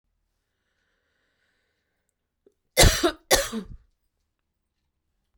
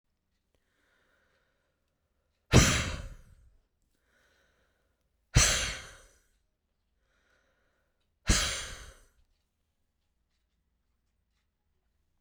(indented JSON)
{
  "cough_length": "5.4 s",
  "cough_amplitude": 25678,
  "cough_signal_mean_std_ratio": 0.23,
  "exhalation_length": "12.2 s",
  "exhalation_amplitude": 15904,
  "exhalation_signal_mean_std_ratio": 0.23,
  "survey_phase": "beta (2021-08-13 to 2022-03-07)",
  "age": "45-64",
  "gender": "Female",
  "wearing_mask": "No",
  "symptom_none": true,
  "smoker_status": "Ex-smoker",
  "respiratory_condition_asthma": false,
  "respiratory_condition_other": false,
  "recruitment_source": "REACT",
  "submission_delay": "2 days",
  "covid_test_result": "Negative",
  "covid_test_method": "RT-qPCR",
  "influenza_a_test_result": "Negative",
  "influenza_b_test_result": "Negative"
}